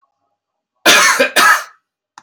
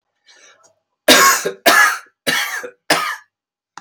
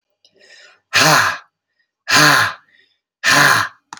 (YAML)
cough_length: 2.2 s
cough_amplitude: 32768
cough_signal_mean_std_ratio: 0.48
three_cough_length: 3.8 s
three_cough_amplitude: 32768
three_cough_signal_mean_std_ratio: 0.45
exhalation_length: 4.0 s
exhalation_amplitude: 32767
exhalation_signal_mean_std_ratio: 0.48
survey_phase: beta (2021-08-13 to 2022-03-07)
age: 45-64
gender: Male
wearing_mask: 'Yes'
symptom_none: true
smoker_status: Never smoked
respiratory_condition_asthma: false
respiratory_condition_other: false
recruitment_source: REACT
submission_delay: 3 days
covid_test_result: Negative
covid_test_method: RT-qPCR